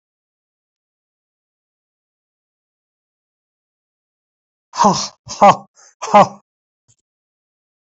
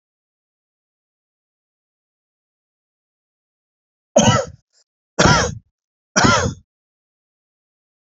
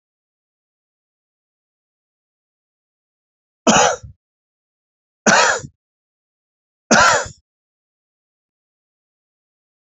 {"exhalation_length": "7.9 s", "exhalation_amplitude": 28286, "exhalation_signal_mean_std_ratio": 0.21, "three_cough_length": "8.0 s", "three_cough_amplitude": 30145, "three_cough_signal_mean_std_ratio": 0.27, "cough_length": "9.9 s", "cough_amplitude": 32768, "cough_signal_mean_std_ratio": 0.25, "survey_phase": "alpha (2021-03-01 to 2021-08-12)", "age": "65+", "gender": "Male", "wearing_mask": "No", "symptom_fatigue": true, "smoker_status": "Ex-smoker", "recruitment_source": "REACT", "submission_delay": "7 days", "covid_test_result": "Negative", "covid_test_method": "RT-qPCR"}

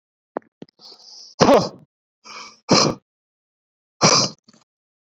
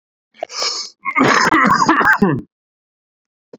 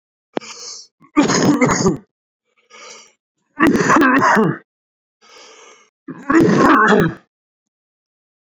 {"exhalation_length": "5.1 s", "exhalation_amplitude": 32768, "exhalation_signal_mean_std_ratio": 0.32, "cough_length": "3.6 s", "cough_amplitude": 30595, "cough_signal_mean_std_ratio": 0.56, "three_cough_length": "8.5 s", "three_cough_amplitude": 32767, "three_cough_signal_mean_std_ratio": 0.49, "survey_phase": "beta (2021-08-13 to 2022-03-07)", "age": "18-44", "gender": "Male", "wearing_mask": "No", "symptom_cough_any": true, "symptom_new_continuous_cough": true, "symptom_runny_or_blocked_nose": true, "symptom_change_to_sense_of_smell_or_taste": true, "symptom_onset": "3 days", "smoker_status": "Ex-smoker", "respiratory_condition_asthma": false, "respiratory_condition_other": false, "recruitment_source": "Test and Trace", "submission_delay": "2 days", "covid_test_result": "Positive", "covid_test_method": "RT-qPCR", "covid_ct_value": 19.2, "covid_ct_gene": "ORF1ab gene"}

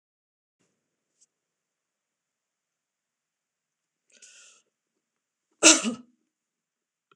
{"cough_length": "7.2 s", "cough_amplitude": 26028, "cough_signal_mean_std_ratio": 0.13, "survey_phase": "beta (2021-08-13 to 2022-03-07)", "age": "65+", "gender": "Female", "wearing_mask": "No", "symptom_none": true, "smoker_status": "Never smoked", "respiratory_condition_asthma": false, "respiratory_condition_other": false, "recruitment_source": "REACT", "submission_delay": "2 days", "covid_test_result": "Negative", "covid_test_method": "RT-qPCR"}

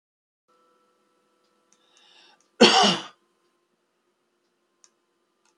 {"cough_length": "5.6 s", "cough_amplitude": 28190, "cough_signal_mean_std_ratio": 0.2, "survey_phase": "beta (2021-08-13 to 2022-03-07)", "age": "65+", "gender": "Male", "wearing_mask": "No", "symptom_none": true, "smoker_status": "Ex-smoker", "respiratory_condition_asthma": false, "respiratory_condition_other": false, "recruitment_source": "REACT", "submission_delay": "2 days", "covid_test_result": "Negative", "covid_test_method": "RT-qPCR", "influenza_a_test_result": "Negative", "influenza_b_test_result": "Negative"}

